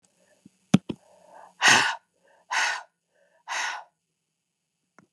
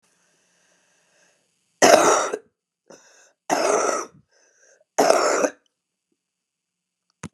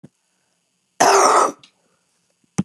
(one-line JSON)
{"exhalation_length": "5.1 s", "exhalation_amplitude": 23596, "exhalation_signal_mean_std_ratio": 0.3, "three_cough_length": "7.3 s", "three_cough_amplitude": 32627, "three_cough_signal_mean_std_ratio": 0.35, "cough_length": "2.6 s", "cough_amplitude": 29826, "cough_signal_mean_std_ratio": 0.38, "survey_phase": "beta (2021-08-13 to 2022-03-07)", "age": "65+", "gender": "Female", "wearing_mask": "No", "symptom_cough_any": true, "symptom_runny_or_blocked_nose": true, "smoker_status": "Ex-smoker", "respiratory_condition_asthma": false, "respiratory_condition_other": false, "recruitment_source": "REACT", "submission_delay": "1 day", "covid_test_result": "Negative", "covid_test_method": "RT-qPCR"}